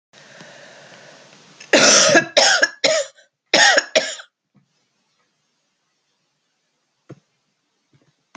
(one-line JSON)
{"cough_length": "8.4 s", "cough_amplitude": 32768, "cough_signal_mean_std_ratio": 0.34, "survey_phase": "beta (2021-08-13 to 2022-03-07)", "age": "45-64", "gender": "Female", "wearing_mask": "No", "symptom_cough_any": true, "symptom_sore_throat": true, "symptom_fatigue": true, "symptom_fever_high_temperature": true, "symptom_headache": true, "symptom_other": true, "smoker_status": "Never smoked", "respiratory_condition_asthma": false, "respiratory_condition_other": false, "recruitment_source": "Test and Trace", "submission_delay": "2 days", "covid_test_result": "Positive", "covid_test_method": "LFT"}